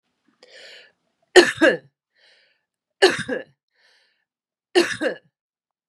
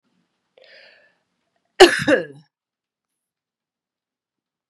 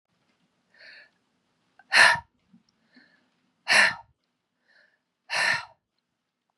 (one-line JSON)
{"three_cough_length": "5.9 s", "three_cough_amplitude": 32767, "three_cough_signal_mean_std_ratio": 0.27, "cough_length": "4.7 s", "cough_amplitude": 32768, "cough_signal_mean_std_ratio": 0.19, "exhalation_length": "6.6 s", "exhalation_amplitude": 21590, "exhalation_signal_mean_std_ratio": 0.26, "survey_phase": "beta (2021-08-13 to 2022-03-07)", "age": "45-64", "gender": "Female", "wearing_mask": "No", "symptom_runny_or_blocked_nose": true, "symptom_headache": true, "smoker_status": "Ex-smoker", "respiratory_condition_asthma": false, "respiratory_condition_other": false, "recruitment_source": "Test and Trace", "submission_delay": "2 days", "covid_test_result": "Positive", "covid_test_method": "ePCR"}